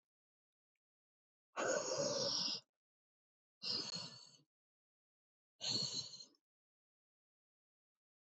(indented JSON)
{
  "exhalation_length": "8.3 s",
  "exhalation_amplitude": 1615,
  "exhalation_signal_mean_std_ratio": 0.4,
  "survey_phase": "beta (2021-08-13 to 2022-03-07)",
  "age": "65+",
  "gender": "Male",
  "wearing_mask": "No",
  "symptom_none": true,
  "smoker_status": "Never smoked",
  "respiratory_condition_asthma": false,
  "respiratory_condition_other": false,
  "recruitment_source": "REACT",
  "submission_delay": "3 days",
  "covid_test_result": "Negative",
  "covid_test_method": "RT-qPCR",
  "influenza_a_test_result": "Negative",
  "influenza_b_test_result": "Negative"
}